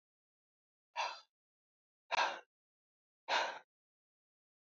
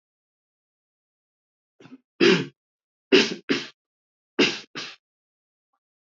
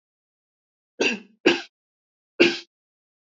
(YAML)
exhalation_length: 4.7 s
exhalation_amplitude: 2738
exhalation_signal_mean_std_ratio: 0.29
three_cough_length: 6.1 s
three_cough_amplitude: 20418
three_cough_signal_mean_std_ratio: 0.26
cough_length: 3.3 s
cough_amplitude: 27012
cough_signal_mean_std_ratio: 0.27
survey_phase: alpha (2021-03-01 to 2021-08-12)
age: 45-64
gender: Male
wearing_mask: 'No'
symptom_none: true
smoker_status: Never smoked
respiratory_condition_asthma: false
respiratory_condition_other: false
recruitment_source: REACT
submission_delay: 3 days
covid_test_result: Negative
covid_test_method: RT-qPCR